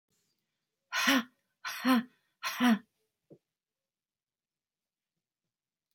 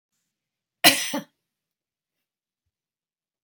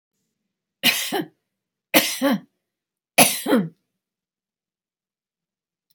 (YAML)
exhalation_length: 5.9 s
exhalation_amplitude: 7473
exhalation_signal_mean_std_ratio: 0.3
cough_length: 3.4 s
cough_amplitude: 32768
cough_signal_mean_std_ratio: 0.19
three_cough_length: 5.9 s
three_cough_amplitude: 32768
three_cough_signal_mean_std_ratio: 0.32
survey_phase: alpha (2021-03-01 to 2021-08-12)
age: 65+
gender: Female
wearing_mask: 'No'
symptom_none: true
smoker_status: Never smoked
respiratory_condition_asthma: false
respiratory_condition_other: false
recruitment_source: REACT
submission_delay: 2 days
covid_test_result: Negative
covid_test_method: RT-qPCR